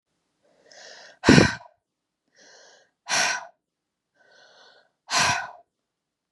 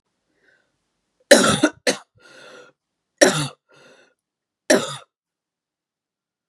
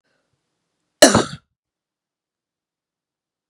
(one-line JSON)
{"exhalation_length": "6.3 s", "exhalation_amplitude": 32768, "exhalation_signal_mean_std_ratio": 0.27, "three_cough_length": "6.5 s", "three_cough_amplitude": 32768, "three_cough_signal_mean_std_ratio": 0.26, "cough_length": "3.5 s", "cough_amplitude": 32768, "cough_signal_mean_std_ratio": 0.18, "survey_phase": "beta (2021-08-13 to 2022-03-07)", "age": "18-44", "gender": "Female", "wearing_mask": "No", "symptom_cough_any": true, "symptom_runny_or_blocked_nose": true, "symptom_sore_throat": true, "symptom_onset": "5 days", "smoker_status": "Never smoked", "respiratory_condition_asthma": false, "respiratory_condition_other": false, "recruitment_source": "Test and Trace", "submission_delay": "1 day", "covid_test_result": "Positive", "covid_test_method": "RT-qPCR", "covid_ct_value": 24.4, "covid_ct_gene": "ORF1ab gene"}